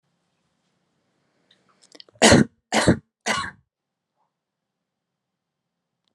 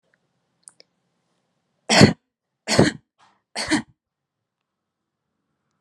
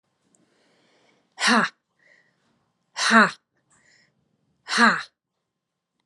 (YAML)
cough_length: 6.1 s
cough_amplitude: 31321
cough_signal_mean_std_ratio: 0.23
three_cough_length: 5.8 s
three_cough_amplitude: 32768
three_cough_signal_mean_std_ratio: 0.23
exhalation_length: 6.1 s
exhalation_amplitude: 29884
exhalation_signal_mean_std_ratio: 0.28
survey_phase: alpha (2021-03-01 to 2021-08-12)
age: 18-44
gender: Female
wearing_mask: 'No'
symptom_none: true
smoker_status: Never smoked
respiratory_condition_asthma: false
respiratory_condition_other: false
recruitment_source: REACT
submission_delay: 3 days
covid_test_result: Negative
covid_test_method: RT-qPCR